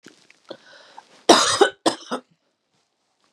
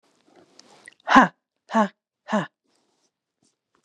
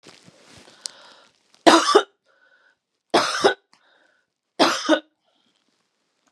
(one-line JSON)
{"cough_length": "3.3 s", "cough_amplitude": 32767, "cough_signal_mean_std_ratio": 0.29, "exhalation_length": "3.8 s", "exhalation_amplitude": 32767, "exhalation_signal_mean_std_ratio": 0.24, "three_cough_length": "6.3 s", "three_cough_amplitude": 32768, "three_cough_signal_mean_std_ratio": 0.3, "survey_phase": "beta (2021-08-13 to 2022-03-07)", "age": "45-64", "gender": "Female", "wearing_mask": "No", "symptom_none": true, "smoker_status": "Never smoked", "respiratory_condition_asthma": false, "respiratory_condition_other": false, "recruitment_source": "REACT", "submission_delay": "8 days", "covid_test_result": "Negative", "covid_test_method": "RT-qPCR", "influenza_a_test_result": "Negative", "influenza_b_test_result": "Negative"}